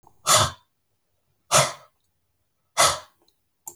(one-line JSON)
{"exhalation_length": "3.8 s", "exhalation_amplitude": 24398, "exhalation_signal_mean_std_ratio": 0.32, "survey_phase": "beta (2021-08-13 to 2022-03-07)", "age": "65+", "gender": "Male", "wearing_mask": "No", "symptom_runny_or_blocked_nose": true, "smoker_status": "Never smoked", "respiratory_condition_asthma": false, "respiratory_condition_other": false, "recruitment_source": "Test and Trace", "submission_delay": "0 days", "covid_test_result": "Negative", "covid_test_method": "LFT"}